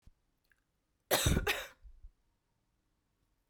cough_length: 3.5 s
cough_amplitude: 5978
cough_signal_mean_std_ratio: 0.3
survey_phase: beta (2021-08-13 to 2022-03-07)
age: 18-44
gender: Female
wearing_mask: 'No'
symptom_cough_any: true
symptom_runny_or_blocked_nose: true
symptom_fatigue: true
symptom_fever_high_temperature: true
symptom_headache: true
symptom_change_to_sense_of_smell_or_taste: true
symptom_other: true
symptom_onset: 2 days
smoker_status: Ex-smoker
respiratory_condition_asthma: false
respiratory_condition_other: false
recruitment_source: Test and Trace
submission_delay: 2 days
covid_test_result: Positive
covid_test_method: RT-qPCR
covid_ct_value: 15.4
covid_ct_gene: ORF1ab gene
covid_ct_mean: 16.9
covid_viral_load: 3000000 copies/ml
covid_viral_load_category: High viral load (>1M copies/ml)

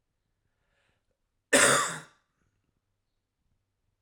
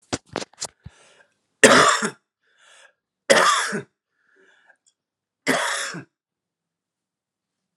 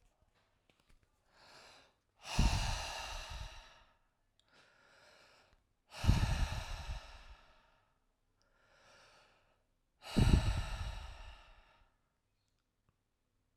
cough_length: 4.0 s
cough_amplitude: 15469
cough_signal_mean_std_ratio: 0.25
three_cough_length: 7.8 s
three_cough_amplitude: 32768
three_cough_signal_mean_std_ratio: 0.31
exhalation_length: 13.6 s
exhalation_amplitude: 7066
exhalation_signal_mean_std_ratio: 0.34
survey_phase: alpha (2021-03-01 to 2021-08-12)
age: 18-44
gender: Male
wearing_mask: 'No'
symptom_loss_of_taste: true
smoker_status: Never smoked
respiratory_condition_asthma: false
respiratory_condition_other: false
recruitment_source: Test and Trace
submission_delay: 1 day
covid_test_result: Positive
covid_test_method: RT-qPCR
covid_ct_value: 19.8
covid_ct_gene: N gene
covid_ct_mean: 20.4
covid_viral_load: 210000 copies/ml
covid_viral_load_category: Low viral load (10K-1M copies/ml)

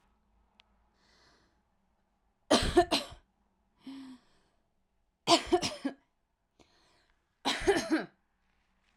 three_cough_length: 9.0 s
three_cough_amplitude: 11770
three_cough_signal_mean_std_ratio: 0.3
survey_phase: beta (2021-08-13 to 2022-03-07)
age: 18-44
gender: Female
wearing_mask: 'No'
symptom_none: true
smoker_status: Current smoker (e-cigarettes or vapes only)
respiratory_condition_asthma: false
respiratory_condition_other: false
recruitment_source: REACT
submission_delay: 0 days
covid_test_result: Negative
covid_test_method: RT-qPCR
influenza_a_test_result: Negative
influenza_b_test_result: Negative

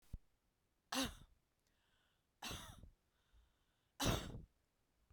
three_cough_length: 5.1 s
three_cough_amplitude: 2544
three_cough_signal_mean_std_ratio: 0.32
survey_phase: beta (2021-08-13 to 2022-03-07)
age: 45-64
gender: Female
wearing_mask: 'No'
symptom_new_continuous_cough: true
symptom_runny_or_blocked_nose: true
symptom_shortness_of_breath: true
symptom_sore_throat: true
symptom_fever_high_temperature: true
symptom_headache: true
smoker_status: Never smoked
respiratory_condition_asthma: false
respiratory_condition_other: false
recruitment_source: Test and Trace
submission_delay: 0 days
covid_test_result: Positive
covid_test_method: LFT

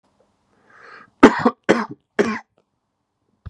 three_cough_length: 3.5 s
three_cough_amplitude: 32768
three_cough_signal_mean_std_ratio: 0.26
survey_phase: beta (2021-08-13 to 2022-03-07)
age: 45-64
gender: Male
wearing_mask: 'No'
symptom_fever_high_temperature: true
smoker_status: Never smoked
respiratory_condition_asthma: false
respiratory_condition_other: false
recruitment_source: REACT
submission_delay: 10 days
covid_test_result: Negative
covid_test_method: RT-qPCR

